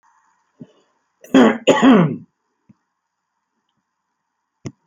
{
  "cough_length": "4.9 s",
  "cough_amplitude": 30038,
  "cough_signal_mean_std_ratio": 0.31,
  "survey_phase": "alpha (2021-03-01 to 2021-08-12)",
  "age": "65+",
  "gender": "Male",
  "wearing_mask": "No",
  "symptom_shortness_of_breath": true,
  "symptom_fatigue": true,
  "smoker_status": "Current smoker (11 or more cigarettes per day)",
  "respiratory_condition_asthma": false,
  "respiratory_condition_other": false,
  "recruitment_source": "REACT",
  "submission_delay": "2 days",
  "covid_test_result": "Negative",
  "covid_test_method": "RT-qPCR"
}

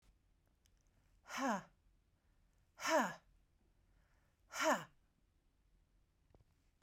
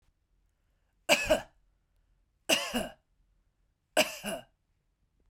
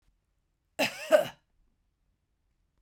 {
  "exhalation_length": "6.8 s",
  "exhalation_amplitude": 2300,
  "exhalation_signal_mean_std_ratio": 0.3,
  "three_cough_length": "5.3 s",
  "three_cough_amplitude": 12265,
  "three_cough_signal_mean_std_ratio": 0.3,
  "cough_length": "2.8 s",
  "cough_amplitude": 12545,
  "cough_signal_mean_std_ratio": 0.24,
  "survey_phase": "beta (2021-08-13 to 2022-03-07)",
  "age": "45-64",
  "gender": "Female",
  "wearing_mask": "No",
  "symptom_none": true,
  "smoker_status": "Never smoked",
  "respiratory_condition_asthma": false,
  "respiratory_condition_other": false,
  "recruitment_source": "REACT",
  "submission_delay": "1 day",
  "covid_test_result": "Negative",
  "covid_test_method": "RT-qPCR"
}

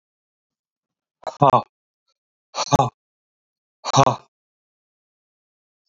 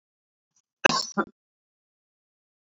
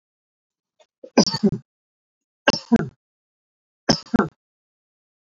{
  "exhalation_length": "5.9 s",
  "exhalation_amplitude": 30851,
  "exhalation_signal_mean_std_ratio": 0.24,
  "cough_length": "2.6 s",
  "cough_amplitude": 28775,
  "cough_signal_mean_std_ratio": 0.19,
  "three_cough_length": "5.3 s",
  "three_cough_amplitude": 31045,
  "three_cough_signal_mean_std_ratio": 0.25,
  "survey_phase": "beta (2021-08-13 to 2022-03-07)",
  "age": "45-64",
  "gender": "Male",
  "wearing_mask": "No",
  "symptom_none": true,
  "smoker_status": "Ex-smoker",
  "respiratory_condition_asthma": false,
  "respiratory_condition_other": false,
  "recruitment_source": "REACT",
  "submission_delay": "1 day",
  "covid_test_result": "Negative",
  "covid_test_method": "RT-qPCR",
  "influenza_a_test_result": "Negative",
  "influenza_b_test_result": "Negative"
}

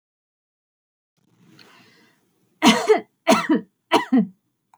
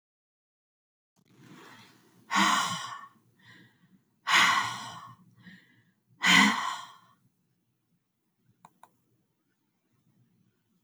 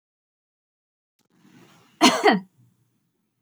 {
  "three_cough_length": "4.8 s",
  "three_cough_amplitude": 27542,
  "three_cough_signal_mean_std_ratio": 0.34,
  "exhalation_length": "10.8 s",
  "exhalation_amplitude": 13119,
  "exhalation_signal_mean_std_ratio": 0.3,
  "cough_length": "3.4 s",
  "cough_amplitude": 25927,
  "cough_signal_mean_std_ratio": 0.25,
  "survey_phase": "beta (2021-08-13 to 2022-03-07)",
  "age": "45-64",
  "gender": "Female",
  "wearing_mask": "No",
  "symptom_none": true,
  "smoker_status": "Prefer not to say",
  "respiratory_condition_asthma": false,
  "respiratory_condition_other": false,
  "recruitment_source": "REACT",
  "submission_delay": "1 day",
  "covid_test_result": "Negative",
  "covid_test_method": "RT-qPCR",
  "influenza_a_test_result": "Unknown/Void",
  "influenza_b_test_result": "Unknown/Void"
}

